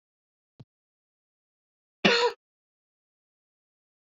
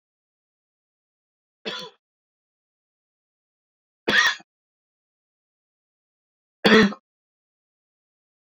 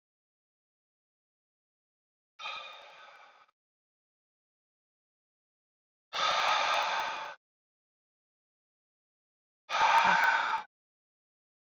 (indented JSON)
{
  "cough_length": "4.0 s",
  "cough_amplitude": 17259,
  "cough_signal_mean_std_ratio": 0.2,
  "three_cough_length": "8.4 s",
  "three_cough_amplitude": 25541,
  "three_cough_signal_mean_std_ratio": 0.2,
  "exhalation_length": "11.7 s",
  "exhalation_amplitude": 7428,
  "exhalation_signal_mean_std_ratio": 0.34,
  "survey_phase": "beta (2021-08-13 to 2022-03-07)",
  "age": "18-44",
  "gender": "Male",
  "wearing_mask": "No",
  "symptom_runny_or_blocked_nose": true,
  "symptom_abdominal_pain": true,
  "symptom_fatigue": true,
  "symptom_fever_high_temperature": true,
  "symptom_headache": true,
  "smoker_status": "Never smoked",
  "respiratory_condition_asthma": false,
  "respiratory_condition_other": false,
  "recruitment_source": "Test and Trace",
  "submission_delay": "2 days",
  "covid_test_result": "Positive",
  "covid_test_method": "LFT"
}